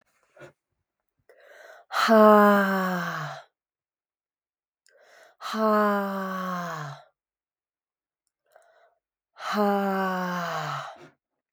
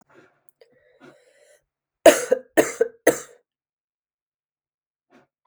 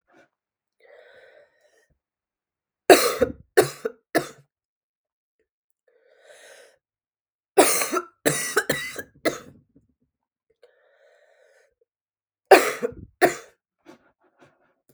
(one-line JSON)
{"exhalation_length": "11.5 s", "exhalation_amplitude": 19762, "exhalation_signal_mean_std_ratio": 0.43, "cough_length": "5.5 s", "cough_amplitude": 32768, "cough_signal_mean_std_ratio": 0.2, "three_cough_length": "14.9 s", "three_cough_amplitude": 32768, "three_cough_signal_mean_std_ratio": 0.24, "survey_phase": "beta (2021-08-13 to 2022-03-07)", "age": "18-44", "gender": "Female", "wearing_mask": "No", "symptom_cough_any": true, "symptom_new_continuous_cough": true, "symptom_runny_or_blocked_nose": true, "symptom_sore_throat": true, "symptom_diarrhoea": true, "symptom_change_to_sense_of_smell_or_taste": true, "symptom_loss_of_taste": true, "symptom_other": true, "smoker_status": "Never smoked", "respiratory_condition_asthma": false, "respiratory_condition_other": false, "recruitment_source": "Test and Trace", "submission_delay": "2 days", "covid_test_result": "Positive", "covid_test_method": "LFT"}